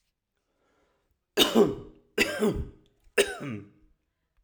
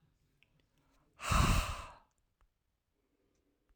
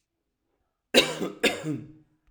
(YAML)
three_cough_length: 4.4 s
three_cough_amplitude: 16939
three_cough_signal_mean_std_ratio: 0.36
exhalation_length: 3.8 s
exhalation_amplitude: 4961
exhalation_signal_mean_std_ratio: 0.3
cough_length: 2.3 s
cough_amplitude: 19247
cough_signal_mean_std_ratio: 0.35
survey_phase: alpha (2021-03-01 to 2021-08-12)
age: 45-64
gender: Male
wearing_mask: 'No'
symptom_none: true
smoker_status: Never smoked
respiratory_condition_asthma: false
respiratory_condition_other: false
recruitment_source: REACT
submission_delay: 2 days
covid_test_result: Negative
covid_test_method: RT-qPCR